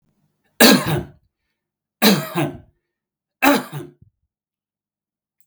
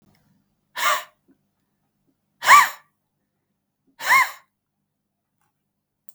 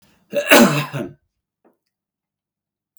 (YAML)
three_cough_length: 5.5 s
three_cough_amplitude: 32768
three_cough_signal_mean_std_ratio: 0.32
exhalation_length: 6.1 s
exhalation_amplitude: 32768
exhalation_signal_mean_std_ratio: 0.24
cough_length: 3.0 s
cough_amplitude: 32768
cough_signal_mean_std_ratio: 0.31
survey_phase: beta (2021-08-13 to 2022-03-07)
age: 45-64
gender: Male
wearing_mask: 'No'
symptom_none: true
smoker_status: Never smoked
respiratory_condition_asthma: true
respiratory_condition_other: false
recruitment_source: REACT
submission_delay: 2 days
covid_test_result: Negative
covid_test_method: RT-qPCR
influenza_a_test_result: Negative
influenza_b_test_result: Negative